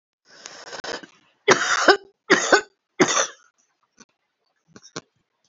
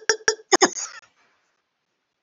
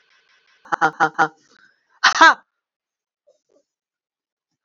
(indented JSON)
{
  "three_cough_length": "5.5 s",
  "three_cough_amplitude": 30122,
  "three_cough_signal_mean_std_ratio": 0.33,
  "cough_length": "2.2 s",
  "cough_amplitude": 28467,
  "cough_signal_mean_std_ratio": 0.26,
  "exhalation_length": "4.6 s",
  "exhalation_amplitude": 29283,
  "exhalation_signal_mean_std_ratio": 0.25,
  "survey_phase": "beta (2021-08-13 to 2022-03-07)",
  "age": "65+",
  "gender": "Female",
  "wearing_mask": "No",
  "symptom_cough_any": true,
  "symptom_runny_or_blocked_nose": true,
  "symptom_onset": "6 days",
  "smoker_status": "Never smoked",
  "respiratory_condition_asthma": false,
  "respiratory_condition_other": false,
  "recruitment_source": "REACT",
  "submission_delay": "3 days",
  "covid_test_result": "Negative",
  "covid_test_method": "RT-qPCR"
}